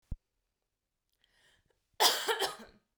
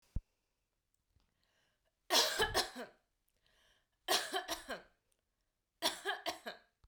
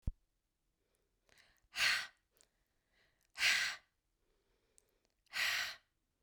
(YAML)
cough_length: 3.0 s
cough_amplitude: 10710
cough_signal_mean_std_ratio: 0.31
three_cough_length: 6.9 s
three_cough_amplitude: 5409
three_cough_signal_mean_std_ratio: 0.35
exhalation_length: 6.2 s
exhalation_amplitude: 3524
exhalation_signal_mean_std_ratio: 0.33
survey_phase: beta (2021-08-13 to 2022-03-07)
age: 18-44
gender: Female
wearing_mask: 'No'
symptom_fatigue: true
symptom_onset: 2 days
smoker_status: Never smoked
respiratory_condition_asthma: false
respiratory_condition_other: false
recruitment_source: REACT
submission_delay: 2 days
covid_test_result: Negative
covid_test_method: RT-qPCR
influenza_a_test_result: Negative
influenza_b_test_result: Negative